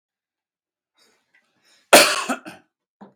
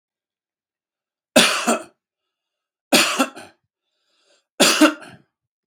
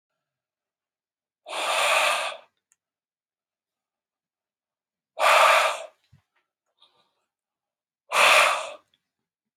{
  "cough_length": "3.2 s",
  "cough_amplitude": 32768,
  "cough_signal_mean_std_ratio": 0.23,
  "three_cough_length": "5.7 s",
  "three_cough_amplitude": 32767,
  "three_cough_signal_mean_std_ratio": 0.32,
  "exhalation_length": "9.6 s",
  "exhalation_amplitude": 19042,
  "exhalation_signal_mean_std_ratio": 0.35,
  "survey_phase": "beta (2021-08-13 to 2022-03-07)",
  "age": "45-64",
  "gender": "Male",
  "wearing_mask": "No",
  "symptom_none": true,
  "smoker_status": "Ex-smoker",
  "respiratory_condition_asthma": false,
  "respiratory_condition_other": false,
  "recruitment_source": "REACT",
  "submission_delay": "2 days",
  "covid_test_result": "Negative",
  "covid_test_method": "RT-qPCR",
  "influenza_a_test_result": "Negative",
  "influenza_b_test_result": "Negative"
}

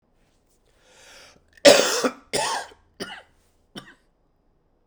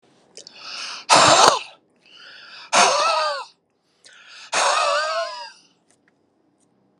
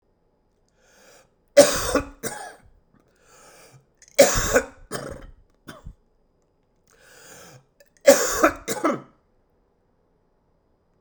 {
  "cough_length": "4.9 s",
  "cough_amplitude": 32768,
  "cough_signal_mean_std_ratio": 0.27,
  "exhalation_length": "7.0 s",
  "exhalation_amplitude": 32768,
  "exhalation_signal_mean_std_ratio": 0.44,
  "three_cough_length": "11.0 s",
  "three_cough_amplitude": 32768,
  "three_cough_signal_mean_std_ratio": 0.27,
  "survey_phase": "alpha (2021-03-01 to 2021-08-12)",
  "age": "45-64",
  "gender": "Male",
  "wearing_mask": "No",
  "symptom_cough_any": true,
  "symptom_fatigue": true,
  "smoker_status": "Ex-smoker",
  "respiratory_condition_asthma": false,
  "respiratory_condition_other": false,
  "recruitment_source": "Test and Trace",
  "submission_delay": "1 day",
  "covid_test_result": "Positive",
  "covid_test_method": "RT-qPCR",
  "covid_ct_value": 17.7,
  "covid_ct_gene": "N gene",
  "covid_ct_mean": 18.3,
  "covid_viral_load": "1000000 copies/ml",
  "covid_viral_load_category": "High viral load (>1M copies/ml)"
}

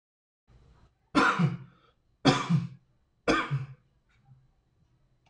{
  "three_cough_length": "5.3 s",
  "three_cough_amplitude": 13811,
  "three_cough_signal_mean_std_ratio": 0.37,
  "survey_phase": "beta (2021-08-13 to 2022-03-07)",
  "age": "45-64",
  "gender": "Male",
  "wearing_mask": "No",
  "symptom_none": true,
  "smoker_status": "Ex-smoker",
  "respiratory_condition_asthma": false,
  "respiratory_condition_other": false,
  "recruitment_source": "REACT",
  "submission_delay": "3 days",
  "covid_test_result": "Negative",
  "covid_test_method": "RT-qPCR",
  "influenza_a_test_result": "Negative",
  "influenza_b_test_result": "Negative"
}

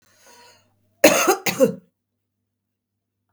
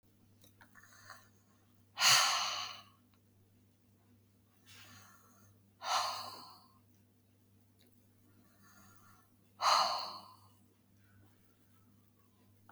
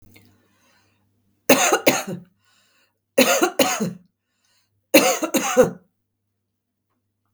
{
  "cough_length": "3.3 s",
  "cough_amplitude": 32768,
  "cough_signal_mean_std_ratio": 0.3,
  "exhalation_length": "12.7 s",
  "exhalation_amplitude": 7089,
  "exhalation_signal_mean_std_ratio": 0.3,
  "three_cough_length": "7.3 s",
  "three_cough_amplitude": 32768,
  "three_cough_signal_mean_std_ratio": 0.36,
  "survey_phase": "beta (2021-08-13 to 2022-03-07)",
  "age": "65+",
  "gender": "Female",
  "wearing_mask": "No",
  "symptom_none": true,
  "smoker_status": "Current smoker (11 or more cigarettes per day)",
  "respiratory_condition_asthma": false,
  "respiratory_condition_other": false,
  "recruitment_source": "REACT",
  "submission_delay": "4 days",
  "covid_test_result": "Negative",
  "covid_test_method": "RT-qPCR",
  "influenza_a_test_result": "Negative",
  "influenza_b_test_result": "Negative"
}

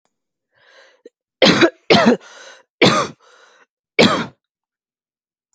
{
  "three_cough_length": "5.5 s",
  "three_cough_amplitude": 32768,
  "three_cough_signal_mean_std_ratio": 0.35,
  "survey_phase": "beta (2021-08-13 to 2022-03-07)",
  "age": "18-44",
  "gender": "Female",
  "wearing_mask": "No",
  "symptom_none": true,
  "symptom_onset": "12 days",
  "smoker_status": "Never smoked",
  "respiratory_condition_asthma": false,
  "respiratory_condition_other": false,
  "recruitment_source": "REACT",
  "submission_delay": "2 days",
  "covid_test_result": "Negative",
  "covid_test_method": "RT-qPCR",
  "influenza_a_test_result": "Negative",
  "influenza_b_test_result": "Negative"
}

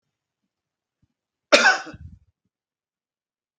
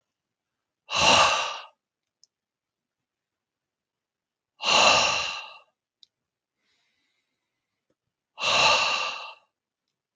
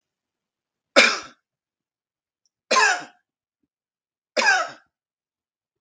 {
  "cough_length": "3.6 s",
  "cough_amplitude": 32768,
  "cough_signal_mean_std_ratio": 0.21,
  "exhalation_length": "10.2 s",
  "exhalation_amplitude": 18077,
  "exhalation_signal_mean_std_ratio": 0.36,
  "three_cough_length": "5.8 s",
  "three_cough_amplitude": 32766,
  "three_cough_signal_mean_std_ratio": 0.29,
  "survey_phase": "beta (2021-08-13 to 2022-03-07)",
  "age": "45-64",
  "gender": "Male",
  "wearing_mask": "No",
  "symptom_none": true,
  "symptom_onset": "10 days",
  "smoker_status": "Never smoked",
  "respiratory_condition_asthma": false,
  "respiratory_condition_other": false,
  "recruitment_source": "REACT",
  "submission_delay": "2 days",
  "covid_test_result": "Negative",
  "covid_test_method": "RT-qPCR",
  "influenza_a_test_result": "Negative",
  "influenza_b_test_result": "Negative"
}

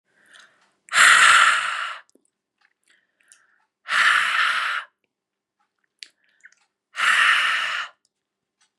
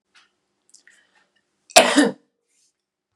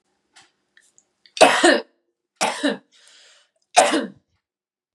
{
  "exhalation_length": "8.8 s",
  "exhalation_amplitude": 29659,
  "exhalation_signal_mean_std_ratio": 0.43,
  "cough_length": "3.2 s",
  "cough_amplitude": 32768,
  "cough_signal_mean_std_ratio": 0.24,
  "three_cough_length": "4.9 s",
  "three_cough_amplitude": 32767,
  "three_cough_signal_mean_std_ratio": 0.32,
  "survey_phase": "beta (2021-08-13 to 2022-03-07)",
  "age": "18-44",
  "gender": "Female",
  "wearing_mask": "No",
  "symptom_cough_any": true,
  "smoker_status": "Never smoked",
  "respiratory_condition_asthma": false,
  "respiratory_condition_other": false,
  "recruitment_source": "REACT",
  "submission_delay": "1 day",
  "covid_test_result": "Negative",
  "covid_test_method": "RT-qPCR",
  "influenza_a_test_result": "Negative",
  "influenza_b_test_result": "Negative"
}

